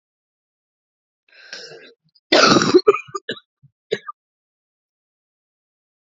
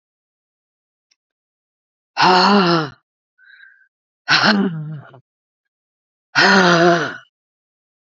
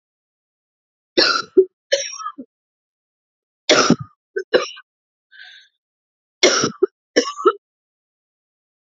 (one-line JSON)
{"cough_length": "6.1 s", "cough_amplitude": 32767, "cough_signal_mean_std_ratio": 0.26, "exhalation_length": "8.1 s", "exhalation_amplitude": 32768, "exhalation_signal_mean_std_ratio": 0.41, "three_cough_length": "8.9 s", "three_cough_amplitude": 32767, "three_cough_signal_mean_std_ratio": 0.31, "survey_phase": "alpha (2021-03-01 to 2021-08-12)", "age": "45-64", "gender": "Female", "wearing_mask": "No", "symptom_cough_any": true, "symptom_shortness_of_breath": true, "symptom_abdominal_pain": true, "symptom_fatigue": true, "symptom_fever_high_temperature": true, "symptom_headache": true, "smoker_status": "Ex-smoker", "respiratory_condition_asthma": false, "respiratory_condition_other": false, "recruitment_source": "Test and Trace", "submission_delay": "2 days", "covid_test_result": "Positive", "covid_test_method": "ePCR"}